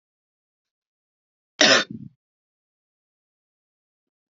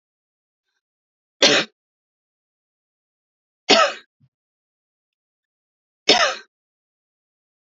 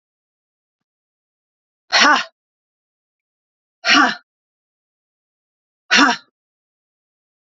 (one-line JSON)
{"cough_length": "4.4 s", "cough_amplitude": 27551, "cough_signal_mean_std_ratio": 0.19, "three_cough_length": "7.8 s", "three_cough_amplitude": 32768, "three_cough_signal_mean_std_ratio": 0.23, "exhalation_length": "7.5 s", "exhalation_amplitude": 32034, "exhalation_signal_mean_std_ratio": 0.26, "survey_phase": "beta (2021-08-13 to 2022-03-07)", "age": "18-44", "gender": "Female", "wearing_mask": "No", "symptom_none": true, "smoker_status": "Never smoked", "respiratory_condition_asthma": false, "respiratory_condition_other": false, "recruitment_source": "REACT", "submission_delay": "2 days", "covid_test_result": "Negative", "covid_test_method": "RT-qPCR", "influenza_a_test_result": "Negative", "influenza_b_test_result": "Negative"}